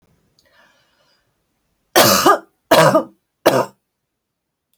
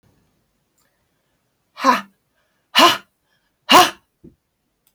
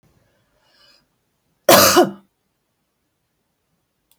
{"three_cough_length": "4.8 s", "three_cough_amplitude": 32768, "three_cough_signal_mean_std_ratio": 0.35, "exhalation_length": "4.9 s", "exhalation_amplitude": 32768, "exhalation_signal_mean_std_ratio": 0.26, "cough_length": "4.2 s", "cough_amplitude": 32768, "cough_signal_mean_std_ratio": 0.24, "survey_phase": "beta (2021-08-13 to 2022-03-07)", "age": "45-64", "gender": "Female", "wearing_mask": "No", "symptom_none": true, "smoker_status": "Ex-smoker", "respiratory_condition_asthma": false, "respiratory_condition_other": false, "recruitment_source": "REACT", "submission_delay": "5 days", "covid_test_result": "Negative", "covid_test_method": "RT-qPCR", "influenza_a_test_result": "Negative", "influenza_b_test_result": "Negative"}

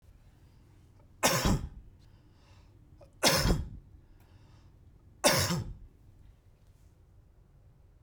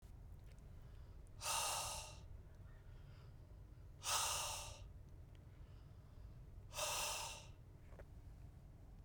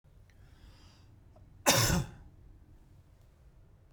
{"three_cough_length": "8.0 s", "three_cough_amplitude": 11717, "three_cough_signal_mean_std_ratio": 0.37, "exhalation_length": "9.0 s", "exhalation_amplitude": 1523, "exhalation_signal_mean_std_ratio": 0.7, "cough_length": "3.9 s", "cough_amplitude": 11266, "cough_signal_mean_std_ratio": 0.32, "survey_phase": "beta (2021-08-13 to 2022-03-07)", "age": "45-64", "gender": "Male", "wearing_mask": "No", "symptom_none": true, "smoker_status": "Ex-smoker", "respiratory_condition_asthma": false, "respiratory_condition_other": false, "recruitment_source": "REACT", "submission_delay": "1 day", "covid_test_result": "Negative", "covid_test_method": "RT-qPCR"}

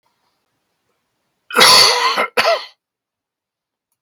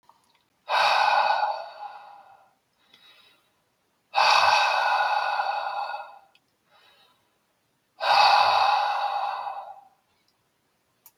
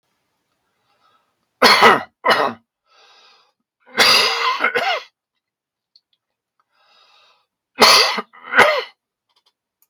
{"cough_length": "4.0 s", "cough_amplitude": 32768, "cough_signal_mean_std_ratio": 0.38, "exhalation_length": "11.2 s", "exhalation_amplitude": 17047, "exhalation_signal_mean_std_ratio": 0.53, "three_cough_length": "9.9 s", "three_cough_amplitude": 32768, "three_cough_signal_mean_std_ratio": 0.37, "survey_phase": "beta (2021-08-13 to 2022-03-07)", "age": "65+", "gender": "Male", "wearing_mask": "No", "symptom_cough_any": true, "symptom_runny_or_blocked_nose": true, "symptom_fatigue": true, "smoker_status": "Never smoked", "respiratory_condition_asthma": false, "respiratory_condition_other": false, "recruitment_source": "Test and Trace", "submission_delay": "2 days", "covid_test_result": "Positive", "covid_test_method": "LFT"}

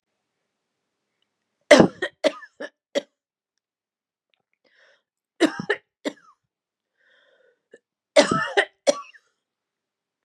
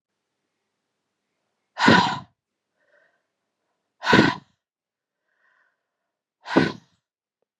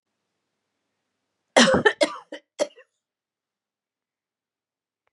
{"three_cough_length": "10.2 s", "three_cough_amplitude": 32768, "three_cough_signal_mean_std_ratio": 0.22, "exhalation_length": "7.6 s", "exhalation_amplitude": 28522, "exhalation_signal_mean_std_ratio": 0.25, "cough_length": "5.1 s", "cough_amplitude": 26991, "cough_signal_mean_std_ratio": 0.23, "survey_phase": "beta (2021-08-13 to 2022-03-07)", "age": "45-64", "gender": "Female", "wearing_mask": "No", "symptom_cough_any": true, "symptom_sore_throat": true, "symptom_fatigue": true, "symptom_loss_of_taste": true, "symptom_onset": "3 days", "smoker_status": "Ex-smoker", "respiratory_condition_asthma": false, "respiratory_condition_other": false, "recruitment_source": "Test and Trace", "submission_delay": "2 days", "covid_test_result": "Positive", "covid_test_method": "RT-qPCR"}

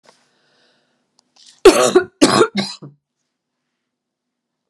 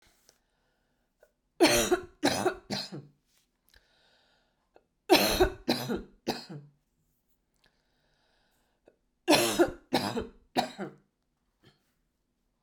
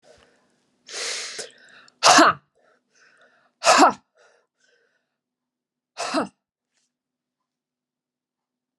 {"cough_length": "4.7 s", "cough_amplitude": 32768, "cough_signal_mean_std_ratio": 0.28, "three_cough_length": "12.6 s", "three_cough_amplitude": 14240, "three_cough_signal_mean_std_ratio": 0.33, "exhalation_length": "8.8 s", "exhalation_amplitude": 28657, "exhalation_signal_mean_std_ratio": 0.25, "survey_phase": "beta (2021-08-13 to 2022-03-07)", "age": "45-64", "gender": "Female", "wearing_mask": "No", "symptom_cough_any": true, "symptom_runny_or_blocked_nose": true, "symptom_sore_throat": true, "symptom_fatigue": true, "symptom_headache": true, "symptom_change_to_sense_of_smell_or_taste": true, "symptom_loss_of_taste": true, "smoker_status": "Never smoked", "respiratory_condition_asthma": false, "respiratory_condition_other": false, "recruitment_source": "Test and Trace", "submission_delay": "2 days", "covid_test_result": "Positive", "covid_test_method": "RT-qPCR", "covid_ct_value": 23.1, "covid_ct_gene": "ORF1ab gene", "covid_ct_mean": 23.8, "covid_viral_load": "16000 copies/ml", "covid_viral_load_category": "Low viral load (10K-1M copies/ml)"}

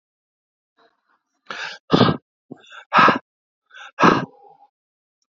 {"exhalation_length": "5.4 s", "exhalation_amplitude": 28147, "exhalation_signal_mean_std_ratio": 0.3, "survey_phase": "beta (2021-08-13 to 2022-03-07)", "age": "18-44", "gender": "Male", "wearing_mask": "No", "symptom_sore_throat": true, "symptom_onset": "4 days", "smoker_status": "Never smoked", "respiratory_condition_asthma": false, "respiratory_condition_other": false, "recruitment_source": "REACT", "submission_delay": "1 day", "covid_test_result": "Negative", "covid_test_method": "RT-qPCR"}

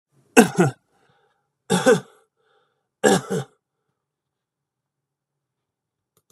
{"three_cough_length": "6.3 s", "three_cough_amplitude": 32768, "three_cough_signal_mean_std_ratio": 0.26, "survey_phase": "beta (2021-08-13 to 2022-03-07)", "age": "45-64", "gender": "Male", "wearing_mask": "No", "symptom_none": true, "smoker_status": "Never smoked", "respiratory_condition_asthma": false, "respiratory_condition_other": false, "recruitment_source": "REACT", "submission_delay": "1 day", "covid_test_result": "Negative", "covid_test_method": "RT-qPCR", "influenza_a_test_result": "Negative", "influenza_b_test_result": "Negative"}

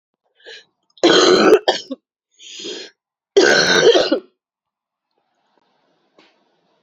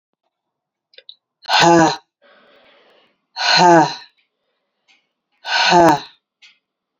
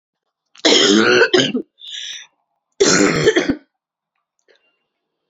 {"cough_length": "6.8 s", "cough_amplitude": 29527, "cough_signal_mean_std_ratio": 0.4, "exhalation_length": "7.0 s", "exhalation_amplitude": 30998, "exhalation_signal_mean_std_ratio": 0.38, "three_cough_length": "5.3 s", "three_cough_amplitude": 32767, "three_cough_signal_mean_std_ratio": 0.47, "survey_phase": "beta (2021-08-13 to 2022-03-07)", "age": "45-64", "gender": "Female", "wearing_mask": "No", "symptom_cough_any": true, "symptom_runny_or_blocked_nose": true, "symptom_sore_throat": true, "symptom_fatigue": true, "symptom_headache": true, "symptom_change_to_sense_of_smell_or_taste": true, "symptom_onset": "4 days", "smoker_status": "Ex-smoker", "respiratory_condition_asthma": false, "respiratory_condition_other": false, "recruitment_source": "Test and Trace", "submission_delay": "2 days", "covid_test_result": "Positive", "covid_test_method": "LAMP"}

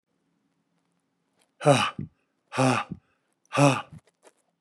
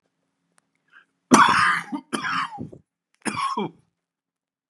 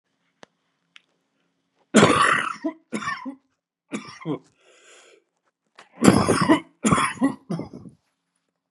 {"exhalation_length": "4.6 s", "exhalation_amplitude": 20010, "exhalation_signal_mean_std_ratio": 0.33, "three_cough_length": "4.7 s", "three_cough_amplitude": 32722, "three_cough_signal_mean_std_ratio": 0.38, "cough_length": "8.7 s", "cough_amplitude": 32767, "cough_signal_mean_std_ratio": 0.37, "survey_phase": "beta (2021-08-13 to 2022-03-07)", "age": "45-64", "gender": "Male", "wearing_mask": "No", "symptom_runny_or_blocked_nose": true, "symptom_change_to_sense_of_smell_or_taste": true, "symptom_loss_of_taste": true, "symptom_onset": "4 days", "smoker_status": "Never smoked", "respiratory_condition_asthma": false, "respiratory_condition_other": false, "recruitment_source": "Test and Trace", "submission_delay": "1 day", "covid_test_result": "Positive", "covid_test_method": "RT-qPCR", "covid_ct_value": 17.2, "covid_ct_gene": "ORF1ab gene", "covid_ct_mean": 17.8, "covid_viral_load": "1400000 copies/ml", "covid_viral_load_category": "High viral load (>1M copies/ml)"}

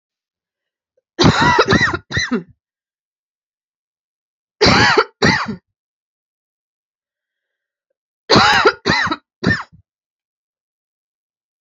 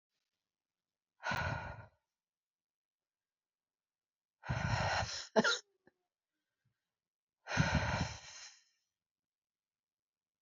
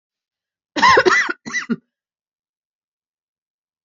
{"three_cough_length": "11.6 s", "three_cough_amplitude": 31468, "three_cough_signal_mean_std_ratio": 0.37, "exhalation_length": "10.4 s", "exhalation_amplitude": 5857, "exhalation_signal_mean_std_ratio": 0.34, "cough_length": "3.8 s", "cough_amplitude": 29508, "cough_signal_mean_std_ratio": 0.32, "survey_phase": "beta (2021-08-13 to 2022-03-07)", "age": "45-64", "gender": "Female", "wearing_mask": "No", "symptom_new_continuous_cough": true, "symptom_runny_or_blocked_nose": true, "symptom_sore_throat": true, "symptom_headache": true, "symptom_change_to_sense_of_smell_or_taste": true, "symptom_loss_of_taste": true, "symptom_onset": "3 days", "smoker_status": "Never smoked", "respiratory_condition_asthma": false, "respiratory_condition_other": false, "recruitment_source": "Test and Trace", "submission_delay": "1 day", "covid_test_result": "Positive", "covid_test_method": "RT-qPCR"}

